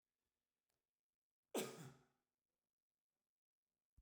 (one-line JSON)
{"three_cough_length": "4.0 s", "three_cough_amplitude": 918, "three_cough_signal_mean_std_ratio": 0.2, "survey_phase": "beta (2021-08-13 to 2022-03-07)", "age": "65+", "gender": "Male", "wearing_mask": "No", "symptom_none": true, "smoker_status": "Ex-smoker", "respiratory_condition_asthma": false, "respiratory_condition_other": false, "recruitment_source": "REACT", "submission_delay": "2 days", "covid_test_result": "Negative", "covid_test_method": "RT-qPCR"}